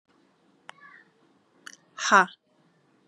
{"exhalation_length": "3.1 s", "exhalation_amplitude": 23034, "exhalation_signal_mean_std_ratio": 0.2, "survey_phase": "beta (2021-08-13 to 2022-03-07)", "age": "18-44", "gender": "Female", "wearing_mask": "No", "symptom_cough_any": true, "symptom_new_continuous_cough": true, "symptom_runny_or_blocked_nose": true, "symptom_shortness_of_breath": true, "symptom_sore_throat": true, "symptom_diarrhoea": true, "symptom_fatigue": true, "symptom_headache": true, "symptom_onset": "3 days", "smoker_status": "Never smoked", "respiratory_condition_asthma": false, "respiratory_condition_other": false, "recruitment_source": "Test and Trace", "submission_delay": "2 days", "covid_test_result": "Positive", "covid_test_method": "RT-qPCR", "covid_ct_value": 25.3, "covid_ct_gene": "ORF1ab gene", "covid_ct_mean": 25.5, "covid_viral_load": "4300 copies/ml", "covid_viral_load_category": "Minimal viral load (< 10K copies/ml)"}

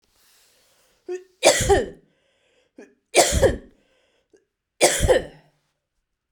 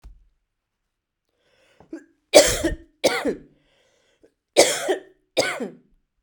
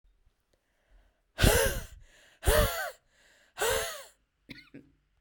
{"three_cough_length": "6.3 s", "three_cough_amplitude": 32767, "three_cough_signal_mean_std_ratio": 0.35, "cough_length": "6.2 s", "cough_amplitude": 32768, "cough_signal_mean_std_ratio": 0.31, "exhalation_length": "5.2 s", "exhalation_amplitude": 13468, "exhalation_signal_mean_std_ratio": 0.38, "survey_phase": "beta (2021-08-13 to 2022-03-07)", "age": "18-44", "gender": "Female", "wearing_mask": "No", "symptom_cough_any": true, "symptom_runny_or_blocked_nose": true, "symptom_sore_throat": true, "symptom_diarrhoea": true, "symptom_fatigue": true, "symptom_fever_high_temperature": true, "symptom_onset": "5 days", "smoker_status": "Never smoked", "respiratory_condition_asthma": false, "respiratory_condition_other": false, "recruitment_source": "Test and Trace", "submission_delay": "1 day", "covid_test_result": "Positive", "covid_test_method": "RT-qPCR", "covid_ct_value": 19.8, "covid_ct_gene": "ORF1ab gene", "covid_ct_mean": 20.2, "covid_viral_load": "230000 copies/ml", "covid_viral_load_category": "Low viral load (10K-1M copies/ml)"}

